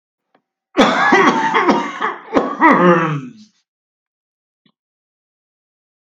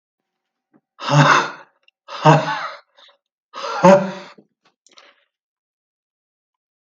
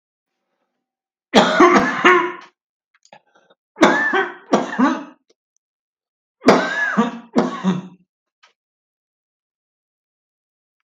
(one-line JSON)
{"cough_length": "6.1 s", "cough_amplitude": 32768, "cough_signal_mean_std_ratio": 0.48, "exhalation_length": "6.8 s", "exhalation_amplitude": 32768, "exhalation_signal_mean_std_ratio": 0.32, "three_cough_length": "10.8 s", "three_cough_amplitude": 32768, "three_cough_signal_mean_std_ratio": 0.39, "survey_phase": "beta (2021-08-13 to 2022-03-07)", "age": "65+", "gender": "Male", "wearing_mask": "No", "symptom_none": true, "smoker_status": "Ex-smoker", "respiratory_condition_asthma": false, "respiratory_condition_other": false, "recruitment_source": "REACT", "submission_delay": "1 day", "covid_test_result": "Negative", "covid_test_method": "RT-qPCR", "influenza_a_test_result": "Negative", "influenza_b_test_result": "Negative"}